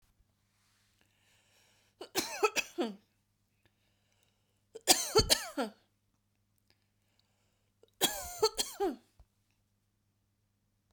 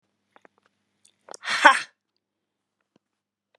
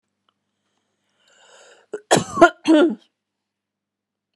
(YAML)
three_cough_length: 10.9 s
three_cough_amplitude: 13682
three_cough_signal_mean_std_ratio: 0.27
exhalation_length: 3.6 s
exhalation_amplitude: 32198
exhalation_signal_mean_std_ratio: 0.19
cough_length: 4.4 s
cough_amplitude: 32767
cough_signal_mean_std_ratio: 0.27
survey_phase: beta (2021-08-13 to 2022-03-07)
age: 45-64
gender: Female
wearing_mask: 'No'
symptom_none: true
smoker_status: Never smoked
respiratory_condition_asthma: true
respiratory_condition_other: false
recruitment_source: REACT
submission_delay: 1 day
covid_test_result: Negative
covid_test_method: RT-qPCR